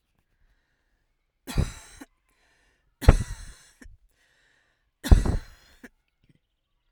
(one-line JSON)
{"three_cough_length": "6.9 s", "three_cough_amplitude": 32767, "three_cough_signal_mean_std_ratio": 0.2, "survey_phase": "alpha (2021-03-01 to 2021-08-12)", "age": "18-44", "gender": "Female", "wearing_mask": "No", "symptom_none": true, "symptom_onset": "2 days", "smoker_status": "Ex-smoker", "respiratory_condition_asthma": false, "respiratory_condition_other": false, "recruitment_source": "REACT", "submission_delay": "4 days", "covid_test_result": "Negative", "covid_test_method": "RT-qPCR"}